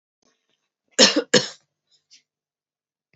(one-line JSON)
{"cough_length": "3.2 s", "cough_amplitude": 32767, "cough_signal_mean_std_ratio": 0.23, "survey_phase": "alpha (2021-03-01 to 2021-08-12)", "age": "45-64", "gender": "Female", "wearing_mask": "No", "symptom_cough_any": true, "symptom_diarrhoea": true, "symptom_fatigue": true, "symptom_headache": true, "symptom_onset": "6 days", "smoker_status": "Never smoked", "respiratory_condition_asthma": false, "respiratory_condition_other": false, "recruitment_source": "Test and Trace", "submission_delay": "2 days", "covid_test_result": "Positive", "covid_test_method": "RT-qPCR", "covid_ct_value": 25.5, "covid_ct_gene": "ORF1ab gene", "covid_ct_mean": 26.4, "covid_viral_load": "2200 copies/ml", "covid_viral_load_category": "Minimal viral load (< 10K copies/ml)"}